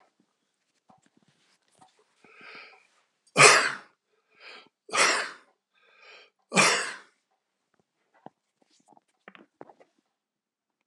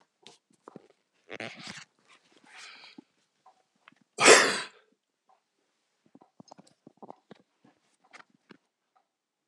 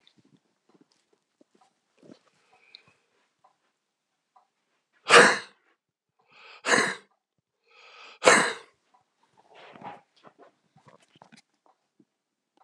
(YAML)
three_cough_length: 10.9 s
three_cough_amplitude: 30735
three_cough_signal_mean_std_ratio: 0.23
cough_length: 9.5 s
cough_amplitude: 25062
cough_signal_mean_std_ratio: 0.17
exhalation_length: 12.6 s
exhalation_amplitude: 32368
exhalation_signal_mean_std_ratio: 0.19
survey_phase: alpha (2021-03-01 to 2021-08-12)
age: 65+
gender: Male
wearing_mask: 'No'
symptom_none: true
smoker_status: Never smoked
respiratory_condition_asthma: true
respiratory_condition_other: true
recruitment_source: REACT
submission_delay: 2 days
covid_test_result: Negative
covid_test_method: RT-qPCR